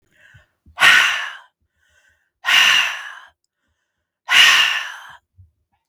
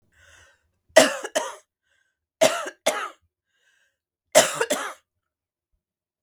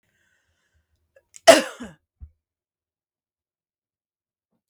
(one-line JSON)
{"exhalation_length": "5.9 s", "exhalation_amplitude": 32768, "exhalation_signal_mean_std_ratio": 0.41, "three_cough_length": "6.2 s", "three_cough_amplitude": 32768, "three_cough_signal_mean_std_ratio": 0.28, "cough_length": "4.7 s", "cough_amplitude": 32766, "cough_signal_mean_std_ratio": 0.14, "survey_phase": "beta (2021-08-13 to 2022-03-07)", "age": "45-64", "gender": "Female", "wearing_mask": "No", "symptom_none": true, "smoker_status": "Ex-smoker", "respiratory_condition_asthma": false, "respiratory_condition_other": false, "recruitment_source": "REACT", "submission_delay": "3 days", "covid_test_result": "Negative", "covid_test_method": "RT-qPCR", "influenza_a_test_result": "Negative", "influenza_b_test_result": "Negative"}